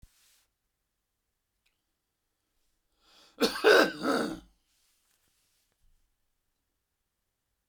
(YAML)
cough_length: 7.7 s
cough_amplitude: 15577
cough_signal_mean_std_ratio: 0.23
survey_phase: beta (2021-08-13 to 2022-03-07)
age: 65+
gender: Male
wearing_mask: 'No'
symptom_none: true
smoker_status: Ex-smoker
respiratory_condition_asthma: false
respiratory_condition_other: false
recruitment_source: REACT
submission_delay: 2 days
covid_test_result: Negative
covid_test_method: RT-qPCR